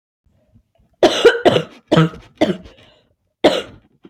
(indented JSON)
{
  "cough_length": "4.1 s",
  "cough_amplitude": 32491,
  "cough_signal_mean_std_ratio": 0.38,
  "survey_phase": "beta (2021-08-13 to 2022-03-07)",
  "age": "18-44",
  "gender": "Female",
  "wearing_mask": "No",
  "symptom_new_continuous_cough": true,
  "symptom_sore_throat": true,
  "symptom_fatigue": true,
  "symptom_fever_high_temperature": true,
  "symptom_headache": true,
  "symptom_onset": "3 days",
  "smoker_status": "Never smoked",
  "respiratory_condition_asthma": false,
  "respiratory_condition_other": false,
  "recruitment_source": "Test and Trace",
  "submission_delay": "1 day",
  "covid_test_result": "Positive",
  "covid_test_method": "RT-qPCR",
  "covid_ct_value": 19.8,
  "covid_ct_gene": "ORF1ab gene",
  "covid_ct_mean": 21.2,
  "covid_viral_load": "120000 copies/ml",
  "covid_viral_load_category": "Low viral load (10K-1M copies/ml)"
}